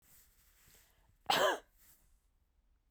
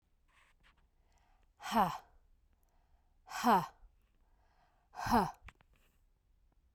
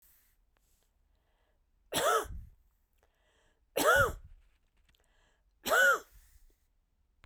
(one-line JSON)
{"cough_length": "2.9 s", "cough_amplitude": 4031, "cough_signal_mean_std_ratio": 0.27, "exhalation_length": "6.7 s", "exhalation_amplitude": 4514, "exhalation_signal_mean_std_ratio": 0.29, "three_cough_length": "7.3 s", "three_cough_amplitude": 6494, "three_cough_signal_mean_std_ratio": 0.32, "survey_phase": "beta (2021-08-13 to 2022-03-07)", "age": "45-64", "gender": "Female", "wearing_mask": "No", "symptom_cough_any": true, "symptom_runny_or_blocked_nose": true, "symptom_shortness_of_breath": true, "symptom_sore_throat": true, "symptom_fatigue": true, "symptom_other": true, "symptom_onset": "3 days", "smoker_status": "Never smoked", "respiratory_condition_asthma": false, "respiratory_condition_other": false, "recruitment_source": "Test and Trace", "submission_delay": "1 day", "covid_test_result": "Positive", "covid_test_method": "RT-qPCR", "covid_ct_value": 19.7, "covid_ct_gene": "N gene"}